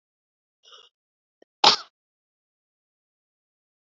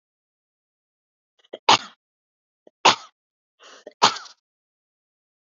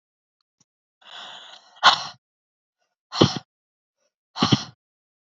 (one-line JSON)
{"cough_length": "3.8 s", "cough_amplitude": 28167, "cough_signal_mean_std_ratio": 0.14, "three_cough_length": "5.5 s", "three_cough_amplitude": 31739, "three_cough_signal_mean_std_ratio": 0.18, "exhalation_length": "5.3 s", "exhalation_amplitude": 32767, "exhalation_signal_mean_std_ratio": 0.24, "survey_phase": "beta (2021-08-13 to 2022-03-07)", "age": "18-44", "gender": "Female", "wearing_mask": "No", "symptom_none": true, "smoker_status": "Never smoked", "respiratory_condition_asthma": false, "respiratory_condition_other": false, "recruitment_source": "REACT", "submission_delay": "1 day", "covid_test_result": "Negative", "covid_test_method": "RT-qPCR", "influenza_a_test_result": "Negative", "influenza_b_test_result": "Negative"}